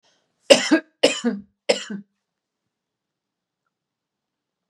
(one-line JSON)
{"three_cough_length": "4.7 s", "three_cough_amplitude": 32768, "three_cough_signal_mean_std_ratio": 0.25, "survey_phase": "beta (2021-08-13 to 2022-03-07)", "age": "45-64", "gender": "Female", "wearing_mask": "No", "symptom_none": true, "smoker_status": "Never smoked", "respiratory_condition_asthma": true, "respiratory_condition_other": false, "recruitment_source": "REACT", "submission_delay": "2 days", "covid_test_result": "Negative", "covid_test_method": "RT-qPCR"}